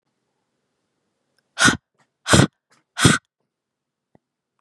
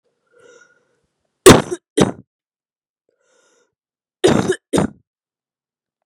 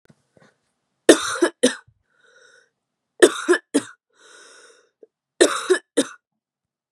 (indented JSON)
{
  "exhalation_length": "4.6 s",
  "exhalation_amplitude": 32768,
  "exhalation_signal_mean_std_ratio": 0.25,
  "cough_length": "6.1 s",
  "cough_amplitude": 32768,
  "cough_signal_mean_std_ratio": 0.24,
  "three_cough_length": "6.9 s",
  "three_cough_amplitude": 32768,
  "three_cough_signal_mean_std_ratio": 0.27,
  "survey_phase": "beta (2021-08-13 to 2022-03-07)",
  "age": "18-44",
  "gender": "Female",
  "wearing_mask": "No",
  "symptom_cough_any": true,
  "symptom_runny_or_blocked_nose": true,
  "symptom_change_to_sense_of_smell_or_taste": true,
  "symptom_onset": "4 days",
  "smoker_status": "Never smoked",
  "respiratory_condition_asthma": true,
  "respiratory_condition_other": false,
  "recruitment_source": "Test and Trace",
  "submission_delay": "1 day",
  "covid_test_result": "Positive",
  "covid_test_method": "RT-qPCR",
  "covid_ct_value": 18.6,
  "covid_ct_gene": "ORF1ab gene",
  "covid_ct_mean": 19.0,
  "covid_viral_load": "570000 copies/ml",
  "covid_viral_load_category": "Low viral load (10K-1M copies/ml)"
}